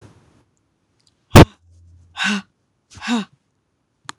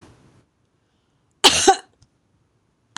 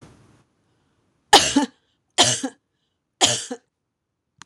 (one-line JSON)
{"exhalation_length": "4.2 s", "exhalation_amplitude": 26028, "exhalation_signal_mean_std_ratio": 0.22, "cough_length": "3.0 s", "cough_amplitude": 26028, "cough_signal_mean_std_ratio": 0.24, "three_cough_length": "4.5 s", "three_cough_amplitude": 26028, "three_cough_signal_mean_std_ratio": 0.3, "survey_phase": "beta (2021-08-13 to 2022-03-07)", "age": "45-64", "gender": "Female", "wearing_mask": "No", "symptom_none": true, "smoker_status": "Never smoked", "respiratory_condition_asthma": false, "respiratory_condition_other": false, "recruitment_source": "REACT", "submission_delay": "2 days", "covid_test_result": "Negative", "covid_test_method": "RT-qPCR", "influenza_a_test_result": "Negative", "influenza_b_test_result": "Negative"}